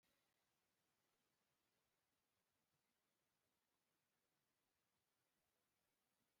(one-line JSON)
{"cough_length": "6.4 s", "cough_amplitude": 8, "cough_signal_mean_std_ratio": 0.77, "survey_phase": "beta (2021-08-13 to 2022-03-07)", "age": "65+", "gender": "Male", "wearing_mask": "No", "symptom_none": true, "symptom_onset": "12 days", "smoker_status": "Never smoked", "respiratory_condition_asthma": false, "respiratory_condition_other": false, "recruitment_source": "REACT", "submission_delay": "1 day", "covid_test_result": "Negative", "covid_test_method": "RT-qPCR"}